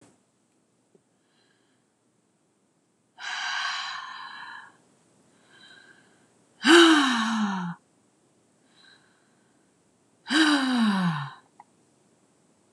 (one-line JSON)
{"exhalation_length": "12.7 s", "exhalation_amplitude": 23825, "exhalation_signal_mean_std_ratio": 0.35, "survey_phase": "beta (2021-08-13 to 2022-03-07)", "age": "65+", "gender": "Female", "wearing_mask": "No", "symptom_none": true, "smoker_status": "Never smoked", "respiratory_condition_asthma": false, "respiratory_condition_other": false, "recruitment_source": "REACT", "submission_delay": "3 days", "covid_test_result": "Negative", "covid_test_method": "RT-qPCR", "influenza_a_test_result": "Negative", "influenza_b_test_result": "Negative"}